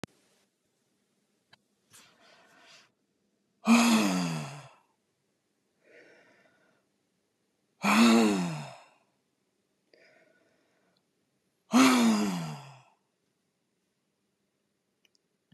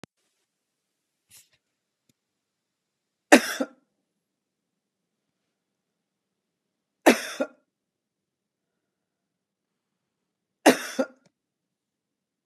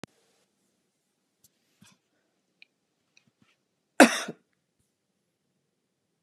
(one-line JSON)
{"exhalation_length": "15.5 s", "exhalation_amplitude": 14423, "exhalation_signal_mean_std_ratio": 0.32, "three_cough_length": "12.5 s", "three_cough_amplitude": 31233, "three_cough_signal_mean_std_ratio": 0.15, "cough_length": "6.2 s", "cough_amplitude": 29804, "cough_signal_mean_std_ratio": 0.12, "survey_phase": "beta (2021-08-13 to 2022-03-07)", "age": "65+", "gender": "Female", "wearing_mask": "No", "symptom_none": true, "smoker_status": "Ex-smoker", "respiratory_condition_asthma": false, "respiratory_condition_other": false, "recruitment_source": "REACT", "submission_delay": "1 day", "covid_test_result": "Negative", "covid_test_method": "RT-qPCR"}